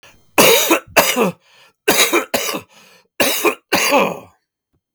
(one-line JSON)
{"three_cough_length": "4.9 s", "three_cough_amplitude": 32768, "three_cough_signal_mean_std_ratio": 0.54, "survey_phase": "beta (2021-08-13 to 2022-03-07)", "age": "45-64", "gender": "Male", "wearing_mask": "No", "symptom_cough_any": true, "symptom_runny_or_blocked_nose": true, "symptom_abdominal_pain": true, "symptom_diarrhoea": true, "symptom_fatigue": true, "symptom_fever_high_temperature": true, "symptom_headache": true, "symptom_change_to_sense_of_smell_or_taste": true, "symptom_loss_of_taste": true, "symptom_onset": "4 days", "smoker_status": "Never smoked", "respiratory_condition_asthma": false, "respiratory_condition_other": false, "recruitment_source": "Test and Trace", "submission_delay": "1 day", "covid_test_result": "Negative", "covid_test_method": "RT-qPCR"}